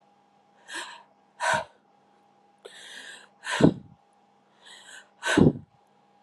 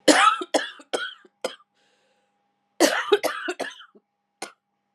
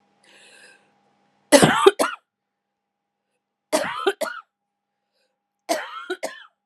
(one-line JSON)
{"exhalation_length": "6.2 s", "exhalation_amplitude": 19665, "exhalation_signal_mean_std_ratio": 0.29, "cough_length": "4.9 s", "cough_amplitude": 30046, "cough_signal_mean_std_ratio": 0.36, "three_cough_length": "6.7 s", "three_cough_amplitude": 32768, "three_cough_signal_mean_std_ratio": 0.29, "survey_phase": "alpha (2021-03-01 to 2021-08-12)", "age": "45-64", "gender": "Female", "wearing_mask": "No", "symptom_new_continuous_cough": true, "symptom_shortness_of_breath": true, "symptom_fatigue": true, "symptom_headache": true, "symptom_onset": "3 days", "smoker_status": "Never smoked", "respiratory_condition_asthma": false, "respiratory_condition_other": false, "recruitment_source": "Test and Trace", "submission_delay": "1 day", "covid_test_result": "Positive", "covid_test_method": "LAMP"}